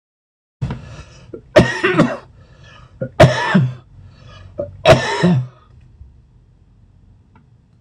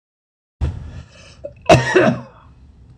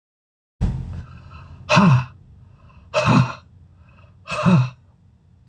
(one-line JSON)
{"three_cough_length": "7.8 s", "three_cough_amplitude": 26028, "three_cough_signal_mean_std_ratio": 0.39, "cough_length": "3.0 s", "cough_amplitude": 26028, "cough_signal_mean_std_ratio": 0.38, "exhalation_length": "5.5 s", "exhalation_amplitude": 24606, "exhalation_signal_mean_std_ratio": 0.43, "survey_phase": "beta (2021-08-13 to 2022-03-07)", "age": "65+", "gender": "Male", "wearing_mask": "No", "symptom_none": true, "smoker_status": "Ex-smoker", "respiratory_condition_asthma": true, "respiratory_condition_other": false, "recruitment_source": "REACT", "submission_delay": "1 day", "covid_test_result": "Negative", "covid_test_method": "RT-qPCR"}